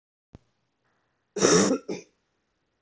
{
  "cough_length": "2.8 s",
  "cough_amplitude": 19309,
  "cough_signal_mean_std_ratio": 0.33,
  "survey_phase": "beta (2021-08-13 to 2022-03-07)",
  "age": "45-64",
  "gender": "Male",
  "wearing_mask": "No",
  "symptom_cough_any": true,
  "symptom_runny_or_blocked_nose": true,
  "symptom_sore_throat": true,
  "symptom_diarrhoea": true,
  "symptom_fatigue": true,
  "symptom_headache": true,
  "symptom_onset": "4 days",
  "smoker_status": "Ex-smoker",
  "respiratory_condition_asthma": false,
  "respiratory_condition_other": false,
  "recruitment_source": "Test and Trace",
  "submission_delay": "1 day",
  "covid_test_result": "Positive",
  "covid_test_method": "RT-qPCR",
  "covid_ct_value": 12.6,
  "covid_ct_gene": "ORF1ab gene"
}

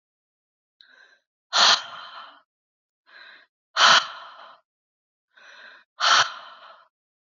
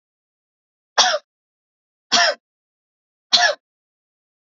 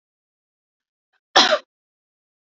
{
  "exhalation_length": "7.3 s",
  "exhalation_amplitude": 24612,
  "exhalation_signal_mean_std_ratio": 0.29,
  "three_cough_length": "4.5 s",
  "three_cough_amplitude": 32768,
  "three_cough_signal_mean_std_ratio": 0.29,
  "cough_length": "2.6 s",
  "cough_amplitude": 30698,
  "cough_signal_mean_std_ratio": 0.22,
  "survey_phase": "beta (2021-08-13 to 2022-03-07)",
  "age": "18-44",
  "gender": "Female",
  "wearing_mask": "No",
  "symptom_none": true,
  "smoker_status": "Never smoked",
  "respiratory_condition_asthma": false,
  "respiratory_condition_other": false,
  "recruitment_source": "REACT",
  "submission_delay": "2 days",
  "covid_test_result": "Negative",
  "covid_test_method": "RT-qPCR",
  "influenza_a_test_result": "Negative",
  "influenza_b_test_result": "Negative"
}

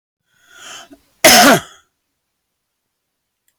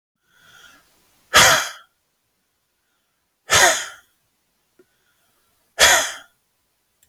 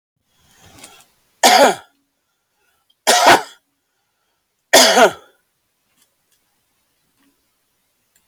{
  "cough_length": "3.6 s",
  "cough_amplitude": 32768,
  "cough_signal_mean_std_ratio": 0.3,
  "exhalation_length": "7.1 s",
  "exhalation_amplitude": 32768,
  "exhalation_signal_mean_std_ratio": 0.29,
  "three_cough_length": "8.3 s",
  "three_cough_amplitude": 32768,
  "three_cough_signal_mean_std_ratio": 0.29,
  "survey_phase": "beta (2021-08-13 to 2022-03-07)",
  "age": "65+",
  "gender": "Male",
  "wearing_mask": "No",
  "symptom_none": true,
  "smoker_status": "Never smoked",
  "respiratory_condition_asthma": false,
  "respiratory_condition_other": false,
  "recruitment_source": "REACT",
  "submission_delay": "1 day",
  "covid_test_result": "Negative",
  "covid_test_method": "RT-qPCR",
  "influenza_a_test_result": "Negative",
  "influenza_b_test_result": "Negative"
}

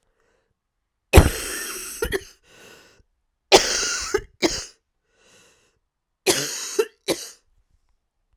{
  "three_cough_length": "8.4 s",
  "three_cough_amplitude": 32768,
  "three_cough_signal_mean_std_ratio": 0.31,
  "survey_phase": "beta (2021-08-13 to 2022-03-07)",
  "age": "18-44",
  "gender": "Female",
  "wearing_mask": "No",
  "symptom_cough_any": true,
  "symptom_new_continuous_cough": true,
  "symptom_runny_or_blocked_nose": true,
  "symptom_fatigue": true,
  "symptom_onset": "2 days",
  "smoker_status": "Ex-smoker",
  "respiratory_condition_asthma": false,
  "respiratory_condition_other": false,
  "recruitment_source": "Test and Trace",
  "submission_delay": "1 day",
  "covid_test_result": "Positive",
  "covid_test_method": "RT-qPCR",
  "covid_ct_value": 20.9,
  "covid_ct_gene": "ORF1ab gene",
  "covid_ct_mean": 20.9,
  "covid_viral_load": "140000 copies/ml",
  "covid_viral_load_category": "Low viral load (10K-1M copies/ml)"
}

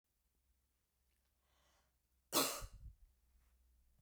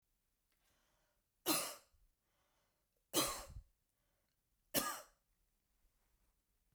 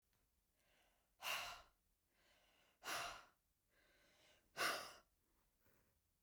{
  "cough_length": "4.0 s",
  "cough_amplitude": 2769,
  "cough_signal_mean_std_ratio": 0.24,
  "three_cough_length": "6.7 s",
  "three_cough_amplitude": 3361,
  "three_cough_signal_mean_std_ratio": 0.27,
  "exhalation_length": "6.2 s",
  "exhalation_amplitude": 1126,
  "exhalation_signal_mean_std_ratio": 0.34,
  "survey_phase": "beta (2021-08-13 to 2022-03-07)",
  "age": "18-44",
  "gender": "Female",
  "wearing_mask": "No",
  "symptom_none": true,
  "smoker_status": "Never smoked",
  "respiratory_condition_asthma": false,
  "respiratory_condition_other": false,
  "recruitment_source": "REACT",
  "submission_delay": "2 days",
  "covid_test_result": "Negative",
  "covid_test_method": "RT-qPCR",
  "influenza_a_test_result": "Unknown/Void",
  "influenza_b_test_result": "Unknown/Void"
}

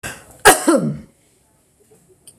{
  "cough_length": "2.4 s",
  "cough_amplitude": 26028,
  "cough_signal_mean_std_ratio": 0.34,
  "survey_phase": "beta (2021-08-13 to 2022-03-07)",
  "age": "65+",
  "gender": "Female",
  "wearing_mask": "No",
  "symptom_none": true,
  "smoker_status": "Ex-smoker",
  "respiratory_condition_asthma": false,
  "respiratory_condition_other": false,
  "recruitment_source": "REACT",
  "submission_delay": "2 days",
  "covid_test_result": "Negative",
  "covid_test_method": "RT-qPCR"
}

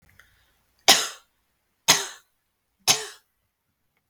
{
  "three_cough_length": "4.1 s",
  "three_cough_amplitude": 32768,
  "three_cough_signal_mean_std_ratio": 0.24,
  "survey_phase": "beta (2021-08-13 to 2022-03-07)",
  "age": "65+",
  "gender": "Female",
  "wearing_mask": "No",
  "symptom_none": true,
  "smoker_status": "Never smoked",
  "respiratory_condition_asthma": false,
  "respiratory_condition_other": false,
  "recruitment_source": "REACT",
  "submission_delay": "3 days",
  "covid_test_result": "Negative",
  "covid_test_method": "RT-qPCR",
  "influenza_a_test_result": "Negative",
  "influenza_b_test_result": "Negative"
}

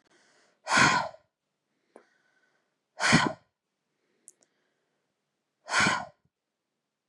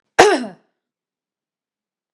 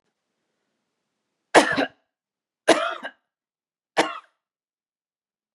{
  "exhalation_length": "7.1 s",
  "exhalation_amplitude": 16769,
  "exhalation_signal_mean_std_ratio": 0.29,
  "cough_length": "2.1 s",
  "cough_amplitude": 32768,
  "cough_signal_mean_std_ratio": 0.25,
  "three_cough_length": "5.5 s",
  "three_cough_amplitude": 32767,
  "three_cough_signal_mean_std_ratio": 0.24,
  "survey_phase": "beta (2021-08-13 to 2022-03-07)",
  "age": "45-64",
  "gender": "Female",
  "wearing_mask": "No",
  "symptom_headache": true,
  "smoker_status": "Never smoked",
  "respiratory_condition_asthma": false,
  "respiratory_condition_other": false,
  "recruitment_source": "REACT",
  "submission_delay": "5 days",
  "covid_test_result": "Negative",
  "covid_test_method": "RT-qPCR",
  "influenza_a_test_result": "Unknown/Void",
  "influenza_b_test_result": "Unknown/Void"
}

